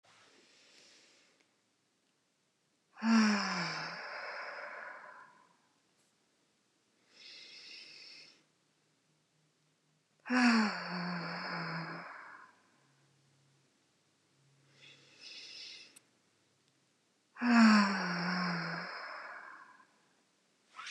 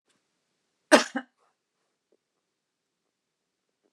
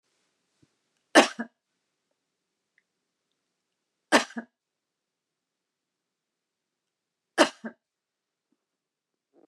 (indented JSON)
{
  "exhalation_length": "20.9 s",
  "exhalation_amplitude": 7476,
  "exhalation_signal_mean_std_ratio": 0.36,
  "cough_length": "3.9 s",
  "cough_amplitude": 27144,
  "cough_signal_mean_std_ratio": 0.13,
  "three_cough_length": "9.5 s",
  "three_cough_amplitude": 26150,
  "three_cough_signal_mean_std_ratio": 0.14,
  "survey_phase": "beta (2021-08-13 to 2022-03-07)",
  "age": "65+",
  "gender": "Female",
  "wearing_mask": "No",
  "symptom_none": true,
  "smoker_status": "Never smoked",
  "respiratory_condition_asthma": false,
  "respiratory_condition_other": false,
  "recruitment_source": "REACT",
  "submission_delay": "5 days",
  "covid_test_result": "Negative",
  "covid_test_method": "RT-qPCR",
  "influenza_a_test_result": "Negative",
  "influenza_b_test_result": "Negative"
}